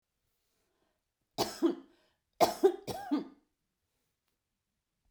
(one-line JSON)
{"cough_length": "5.1 s", "cough_amplitude": 10087, "cough_signal_mean_std_ratio": 0.28, "survey_phase": "beta (2021-08-13 to 2022-03-07)", "age": "45-64", "gender": "Female", "wearing_mask": "No", "symptom_none": true, "smoker_status": "Never smoked", "respiratory_condition_asthma": false, "respiratory_condition_other": false, "recruitment_source": "REACT", "submission_delay": "2 days", "covid_test_result": "Negative", "covid_test_method": "RT-qPCR"}